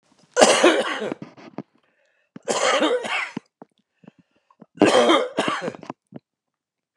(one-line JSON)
{"three_cough_length": "7.0 s", "three_cough_amplitude": 29204, "three_cough_signal_mean_std_ratio": 0.44, "survey_phase": "beta (2021-08-13 to 2022-03-07)", "age": "65+", "gender": "Male", "wearing_mask": "No", "symptom_none": true, "smoker_status": "Never smoked", "respiratory_condition_asthma": false, "respiratory_condition_other": false, "recruitment_source": "REACT", "submission_delay": "4 days", "covid_test_result": "Negative", "covid_test_method": "RT-qPCR"}